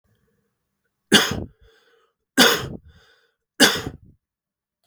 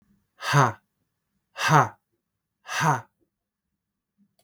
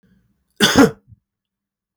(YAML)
three_cough_length: 4.9 s
three_cough_amplitude: 32768
three_cough_signal_mean_std_ratio: 0.29
exhalation_length: 4.4 s
exhalation_amplitude: 23655
exhalation_signal_mean_std_ratio: 0.32
cough_length: 2.0 s
cough_amplitude: 32768
cough_signal_mean_std_ratio: 0.29
survey_phase: beta (2021-08-13 to 2022-03-07)
age: 18-44
gender: Male
wearing_mask: 'No'
symptom_fatigue: true
symptom_change_to_sense_of_smell_or_taste: true
symptom_loss_of_taste: true
symptom_onset: 2 days
smoker_status: Never smoked
respiratory_condition_asthma: false
respiratory_condition_other: false
recruitment_source: Test and Trace
submission_delay: 2 days
covid_test_result: Positive
covid_test_method: RT-qPCR